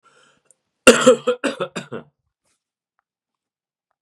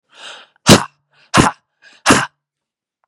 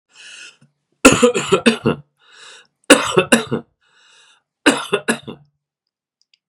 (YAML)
cough_length: 4.0 s
cough_amplitude: 32768
cough_signal_mean_std_ratio: 0.25
exhalation_length: 3.1 s
exhalation_amplitude: 32768
exhalation_signal_mean_std_ratio: 0.31
three_cough_length: 6.5 s
three_cough_amplitude: 32768
three_cough_signal_mean_std_ratio: 0.35
survey_phase: beta (2021-08-13 to 2022-03-07)
age: 45-64
gender: Male
wearing_mask: 'No'
symptom_cough_any: true
symptom_fatigue: true
symptom_headache: true
symptom_other: true
symptom_onset: 2 days
smoker_status: Never smoked
respiratory_condition_asthma: false
respiratory_condition_other: false
recruitment_source: REACT
submission_delay: 1 day
covid_test_result: Positive
covid_test_method: RT-qPCR
covid_ct_value: 19.0
covid_ct_gene: E gene
influenza_a_test_result: Negative
influenza_b_test_result: Negative